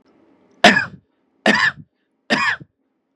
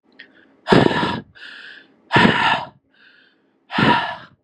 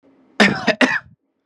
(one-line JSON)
{"three_cough_length": "3.2 s", "three_cough_amplitude": 32768, "three_cough_signal_mean_std_ratio": 0.36, "exhalation_length": "4.4 s", "exhalation_amplitude": 32768, "exhalation_signal_mean_std_ratio": 0.45, "cough_length": "1.5 s", "cough_amplitude": 32767, "cough_signal_mean_std_ratio": 0.43, "survey_phase": "beta (2021-08-13 to 2022-03-07)", "age": "18-44", "gender": "Male", "wearing_mask": "No", "symptom_none": true, "smoker_status": "Ex-smoker", "respiratory_condition_asthma": false, "respiratory_condition_other": false, "recruitment_source": "REACT", "submission_delay": "2 days", "covid_test_result": "Negative", "covid_test_method": "RT-qPCR", "influenza_a_test_result": "Negative", "influenza_b_test_result": "Negative"}